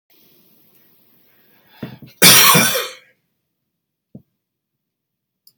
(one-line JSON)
{"cough_length": "5.6 s", "cough_amplitude": 32768, "cough_signal_mean_std_ratio": 0.27, "survey_phase": "beta (2021-08-13 to 2022-03-07)", "age": "65+", "gender": "Male", "wearing_mask": "No", "symptom_cough_any": true, "symptom_new_continuous_cough": true, "symptom_runny_or_blocked_nose": true, "symptom_shortness_of_breath": true, "symptom_sore_throat": true, "symptom_diarrhoea": true, "symptom_fatigue": true, "symptom_fever_high_temperature": true, "symptom_other": true, "symptom_onset": "3 days", "smoker_status": "Never smoked", "respiratory_condition_asthma": true, "respiratory_condition_other": false, "recruitment_source": "Test and Trace", "submission_delay": "1 day", "covid_test_result": "Positive", "covid_test_method": "RT-qPCR"}